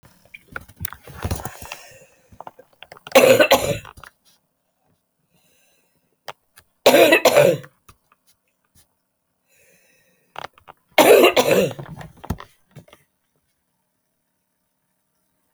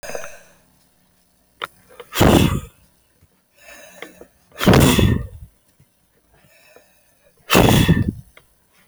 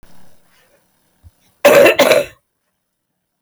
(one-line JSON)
{"three_cough_length": "15.5 s", "three_cough_amplitude": 32768, "three_cough_signal_mean_std_ratio": 0.3, "exhalation_length": "8.9 s", "exhalation_amplitude": 32510, "exhalation_signal_mean_std_ratio": 0.36, "cough_length": "3.4 s", "cough_amplitude": 32767, "cough_signal_mean_std_ratio": 0.35, "survey_phase": "alpha (2021-03-01 to 2021-08-12)", "age": "65+", "gender": "Female", "wearing_mask": "No", "symptom_none": true, "smoker_status": "Ex-smoker", "respiratory_condition_asthma": true, "respiratory_condition_other": false, "recruitment_source": "REACT", "submission_delay": "2 days", "covid_test_result": "Negative", "covid_test_method": "RT-qPCR"}